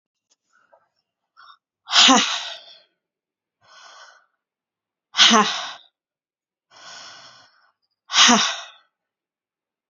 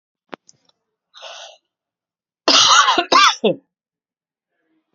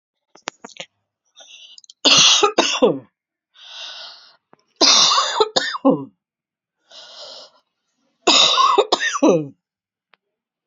{"exhalation_length": "9.9 s", "exhalation_amplitude": 32767, "exhalation_signal_mean_std_ratio": 0.29, "cough_length": "4.9 s", "cough_amplitude": 31750, "cough_signal_mean_std_ratio": 0.35, "three_cough_length": "10.7 s", "three_cough_amplitude": 32759, "three_cough_signal_mean_std_ratio": 0.43, "survey_phase": "beta (2021-08-13 to 2022-03-07)", "age": "45-64", "gender": "Female", "wearing_mask": "No", "symptom_cough_any": true, "symptom_runny_or_blocked_nose": true, "symptom_shortness_of_breath": true, "symptom_fatigue": true, "symptom_fever_high_temperature": true, "symptom_headache": true, "smoker_status": "Ex-smoker", "respiratory_condition_asthma": false, "respiratory_condition_other": false, "recruitment_source": "Test and Trace", "submission_delay": "3 days", "covid_test_result": "Positive", "covid_test_method": "LFT"}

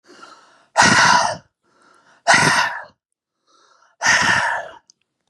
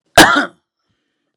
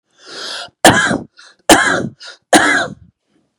{"exhalation_length": "5.3 s", "exhalation_amplitude": 32311, "exhalation_signal_mean_std_ratio": 0.47, "cough_length": "1.4 s", "cough_amplitude": 32768, "cough_signal_mean_std_ratio": 0.35, "three_cough_length": "3.6 s", "three_cough_amplitude": 32768, "three_cough_signal_mean_std_ratio": 0.46, "survey_phase": "beta (2021-08-13 to 2022-03-07)", "age": "18-44", "gender": "Male", "wearing_mask": "No", "symptom_none": true, "symptom_onset": "6 days", "smoker_status": "Never smoked", "respiratory_condition_asthma": false, "respiratory_condition_other": false, "recruitment_source": "REACT", "submission_delay": "10 days", "covid_test_result": "Negative", "covid_test_method": "RT-qPCR", "influenza_a_test_result": "Negative", "influenza_b_test_result": "Negative"}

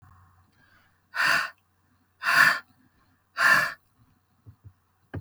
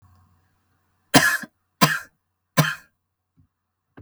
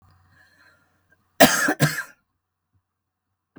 {"exhalation_length": "5.2 s", "exhalation_amplitude": 19654, "exhalation_signal_mean_std_ratio": 0.36, "three_cough_length": "4.0 s", "three_cough_amplitude": 32768, "three_cough_signal_mean_std_ratio": 0.27, "cough_length": "3.6 s", "cough_amplitude": 32768, "cough_signal_mean_std_ratio": 0.26, "survey_phase": "beta (2021-08-13 to 2022-03-07)", "age": "18-44", "gender": "Female", "wearing_mask": "No", "symptom_sore_throat": true, "symptom_fatigue": true, "symptom_headache": true, "smoker_status": "Current smoker (11 or more cigarettes per day)", "respiratory_condition_asthma": false, "respiratory_condition_other": false, "recruitment_source": "REACT", "submission_delay": "3 days", "covid_test_result": "Negative", "covid_test_method": "RT-qPCR", "influenza_a_test_result": "Negative", "influenza_b_test_result": "Negative"}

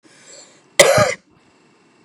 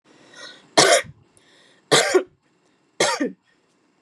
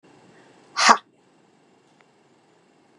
{"cough_length": "2.0 s", "cough_amplitude": 32768, "cough_signal_mean_std_ratio": 0.33, "three_cough_length": "4.0 s", "three_cough_amplitude": 30149, "three_cough_signal_mean_std_ratio": 0.36, "exhalation_length": "3.0 s", "exhalation_amplitude": 32767, "exhalation_signal_mean_std_ratio": 0.2, "survey_phase": "beta (2021-08-13 to 2022-03-07)", "age": "18-44", "gender": "Female", "wearing_mask": "No", "symptom_runny_or_blocked_nose": true, "symptom_fatigue": true, "symptom_headache": true, "symptom_onset": "11 days", "smoker_status": "Never smoked", "respiratory_condition_asthma": false, "respiratory_condition_other": false, "recruitment_source": "REACT", "submission_delay": "4 days", "covid_test_result": "Negative", "covid_test_method": "RT-qPCR", "influenza_a_test_result": "Negative", "influenza_b_test_result": "Negative"}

